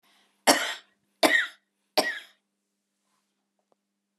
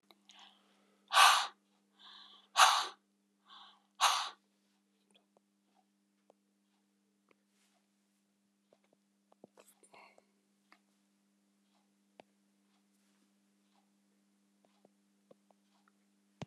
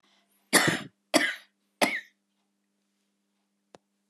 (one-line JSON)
{"three_cough_length": "4.2 s", "three_cough_amplitude": 27286, "three_cough_signal_mean_std_ratio": 0.28, "exhalation_length": "16.5 s", "exhalation_amplitude": 10293, "exhalation_signal_mean_std_ratio": 0.18, "cough_length": "4.1 s", "cough_amplitude": 19814, "cough_signal_mean_std_ratio": 0.29, "survey_phase": "alpha (2021-03-01 to 2021-08-12)", "age": "65+", "gender": "Female", "wearing_mask": "No", "symptom_none": true, "smoker_status": "Never smoked", "respiratory_condition_asthma": false, "respiratory_condition_other": false, "recruitment_source": "REACT", "submission_delay": "4 days", "covid_test_result": "Negative", "covid_test_method": "RT-qPCR"}